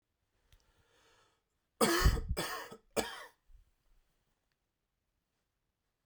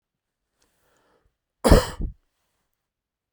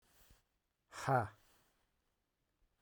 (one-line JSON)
{"three_cough_length": "6.1 s", "three_cough_amplitude": 5965, "three_cough_signal_mean_std_ratio": 0.29, "cough_length": "3.3 s", "cough_amplitude": 32767, "cough_signal_mean_std_ratio": 0.2, "exhalation_length": "2.8 s", "exhalation_amplitude": 2907, "exhalation_signal_mean_std_ratio": 0.25, "survey_phase": "beta (2021-08-13 to 2022-03-07)", "age": "45-64", "gender": "Male", "wearing_mask": "No", "symptom_none": true, "smoker_status": "Never smoked", "respiratory_condition_asthma": false, "respiratory_condition_other": false, "recruitment_source": "REACT", "submission_delay": "2 days", "covid_test_result": "Negative", "covid_test_method": "RT-qPCR", "influenza_a_test_result": "Negative", "influenza_b_test_result": "Negative"}